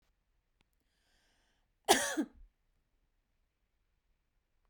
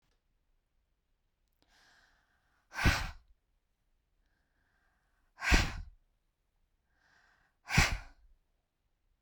cough_length: 4.7 s
cough_amplitude: 10660
cough_signal_mean_std_ratio: 0.19
exhalation_length: 9.2 s
exhalation_amplitude: 9132
exhalation_signal_mean_std_ratio: 0.24
survey_phase: beta (2021-08-13 to 2022-03-07)
age: 45-64
gender: Female
wearing_mask: 'No'
symptom_none: true
smoker_status: Never smoked
respiratory_condition_asthma: false
respiratory_condition_other: false
recruitment_source: REACT
submission_delay: 1 day
covid_test_result: Negative
covid_test_method: RT-qPCR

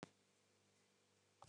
cough_length: 1.5 s
cough_amplitude: 593
cough_signal_mean_std_ratio: 0.35
survey_phase: beta (2021-08-13 to 2022-03-07)
age: 65+
gender: Female
wearing_mask: 'No'
symptom_none: true
smoker_status: Never smoked
respiratory_condition_asthma: false
respiratory_condition_other: false
recruitment_source: REACT
submission_delay: 1 day
covid_test_result: Negative
covid_test_method: RT-qPCR
influenza_a_test_result: Negative
influenza_b_test_result: Negative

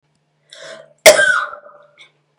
cough_length: 2.4 s
cough_amplitude: 32768
cough_signal_mean_std_ratio: 0.32
survey_phase: beta (2021-08-13 to 2022-03-07)
age: 18-44
gender: Female
wearing_mask: 'No'
symptom_cough_any: true
symptom_runny_or_blocked_nose: true
symptom_shortness_of_breath: true
symptom_sore_throat: true
symptom_diarrhoea: true
symptom_headache: true
symptom_onset: 4 days
smoker_status: Ex-smoker
respiratory_condition_asthma: false
respiratory_condition_other: false
recruitment_source: Test and Trace
submission_delay: 2 days
covid_test_method: ePCR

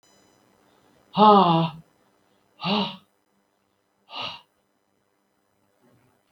exhalation_length: 6.3 s
exhalation_amplitude: 23541
exhalation_signal_mean_std_ratio: 0.28
survey_phase: beta (2021-08-13 to 2022-03-07)
age: 65+
gender: Male
wearing_mask: 'No'
symptom_none: true
smoker_status: Ex-smoker
respiratory_condition_asthma: false
respiratory_condition_other: false
recruitment_source: REACT
submission_delay: 3 days
covid_test_result: Negative
covid_test_method: RT-qPCR
influenza_a_test_result: Negative
influenza_b_test_result: Negative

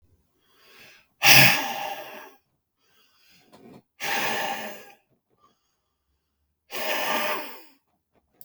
exhalation_length: 8.4 s
exhalation_amplitude: 32766
exhalation_signal_mean_std_ratio: 0.32
survey_phase: beta (2021-08-13 to 2022-03-07)
age: 45-64
gender: Male
wearing_mask: 'No'
symptom_none: true
symptom_onset: 3 days
smoker_status: Current smoker (11 or more cigarettes per day)
respiratory_condition_asthma: true
respiratory_condition_other: false
recruitment_source: REACT
submission_delay: 2 days
covid_test_result: Negative
covid_test_method: RT-qPCR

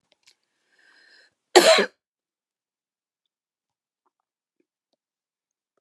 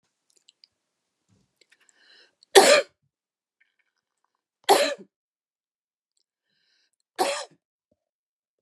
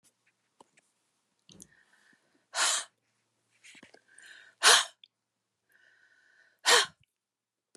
cough_length: 5.8 s
cough_amplitude: 32006
cough_signal_mean_std_ratio: 0.17
three_cough_length: 8.6 s
three_cough_amplitude: 32702
three_cough_signal_mean_std_ratio: 0.2
exhalation_length: 7.8 s
exhalation_amplitude: 16934
exhalation_signal_mean_std_ratio: 0.23
survey_phase: alpha (2021-03-01 to 2021-08-12)
age: 65+
gender: Female
wearing_mask: 'No'
symptom_none: true
smoker_status: Ex-smoker
recruitment_source: REACT
submission_delay: 2 days
covid_test_result: Negative
covid_test_method: RT-qPCR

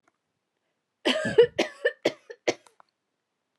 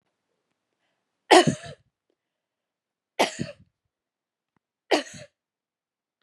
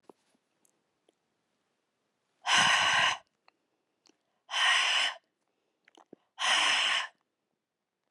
cough_length: 3.6 s
cough_amplitude: 17176
cough_signal_mean_std_ratio: 0.3
three_cough_length: 6.2 s
three_cough_amplitude: 29176
three_cough_signal_mean_std_ratio: 0.19
exhalation_length: 8.1 s
exhalation_amplitude: 9183
exhalation_signal_mean_std_ratio: 0.42
survey_phase: beta (2021-08-13 to 2022-03-07)
age: 45-64
gender: Female
wearing_mask: 'No'
symptom_fatigue: true
smoker_status: Ex-smoker
respiratory_condition_asthma: false
respiratory_condition_other: false
recruitment_source: REACT
submission_delay: 0 days
covid_test_result: Negative
covid_test_method: RT-qPCR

